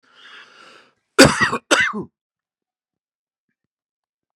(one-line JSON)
{"cough_length": "4.4 s", "cough_amplitude": 32768, "cough_signal_mean_std_ratio": 0.26, "survey_phase": "beta (2021-08-13 to 2022-03-07)", "age": "45-64", "gender": "Male", "wearing_mask": "No", "symptom_runny_or_blocked_nose": true, "symptom_onset": "12 days", "smoker_status": "Ex-smoker", "respiratory_condition_asthma": false, "respiratory_condition_other": false, "recruitment_source": "REACT", "submission_delay": "1 day", "covid_test_result": "Negative", "covid_test_method": "RT-qPCR", "influenza_a_test_result": "Negative", "influenza_b_test_result": "Negative"}